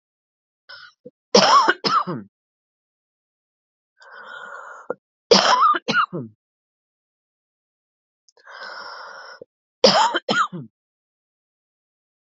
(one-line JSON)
{"three_cough_length": "12.4 s", "three_cough_amplitude": 32767, "three_cough_signal_mean_std_ratio": 0.33, "survey_phase": "beta (2021-08-13 to 2022-03-07)", "age": "45-64", "gender": "Female", "wearing_mask": "No", "symptom_cough_any": true, "symptom_runny_or_blocked_nose": true, "symptom_sore_throat": true, "symptom_fatigue": true, "symptom_headache": true, "symptom_change_to_sense_of_smell_or_taste": true, "symptom_onset": "5 days", "smoker_status": "Never smoked", "respiratory_condition_asthma": true, "respiratory_condition_other": false, "recruitment_source": "Test and Trace", "submission_delay": "2 days", "covid_test_result": "Positive", "covid_test_method": "RT-qPCR", "covid_ct_value": 14.4, "covid_ct_gene": "ORF1ab gene"}